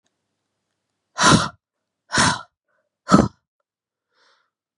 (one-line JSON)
{"exhalation_length": "4.8 s", "exhalation_amplitude": 32767, "exhalation_signal_mean_std_ratio": 0.28, "survey_phase": "beta (2021-08-13 to 2022-03-07)", "age": "18-44", "gender": "Female", "wearing_mask": "No", "symptom_cough_any": true, "symptom_runny_or_blocked_nose": true, "symptom_shortness_of_breath": true, "symptom_sore_throat": true, "symptom_fatigue": true, "symptom_headache": true, "smoker_status": "Never smoked", "respiratory_condition_asthma": true, "respiratory_condition_other": false, "recruitment_source": "Test and Trace", "submission_delay": "2 days", "covid_test_result": "Positive", "covid_test_method": "ePCR"}